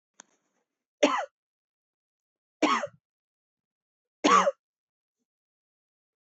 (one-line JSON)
{"three_cough_length": "6.2 s", "three_cough_amplitude": 14083, "three_cough_signal_mean_std_ratio": 0.25, "survey_phase": "beta (2021-08-13 to 2022-03-07)", "age": "45-64", "gender": "Female", "wearing_mask": "No", "symptom_cough_any": true, "symptom_runny_or_blocked_nose": true, "symptom_fatigue": true, "smoker_status": "Never smoked", "respiratory_condition_asthma": false, "respiratory_condition_other": false, "recruitment_source": "Test and Trace", "submission_delay": "1 day", "covid_test_result": "Positive", "covid_test_method": "LFT"}